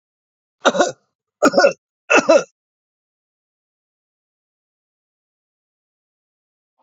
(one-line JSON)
{"three_cough_length": "6.8 s", "three_cough_amplitude": 29944, "three_cough_signal_mean_std_ratio": 0.25, "survey_phase": "alpha (2021-03-01 to 2021-08-12)", "age": "65+", "gender": "Male", "wearing_mask": "No", "symptom_none": true, "smoker_status": "Never smoked", "respiratory_condition_asthma": false, "respiratory_condition_other": false, "recruitment_source": "REACT", "submission_delay": "2 days", "covid_test_result": "Negative", "covid_test_method": "RT-qPCR"}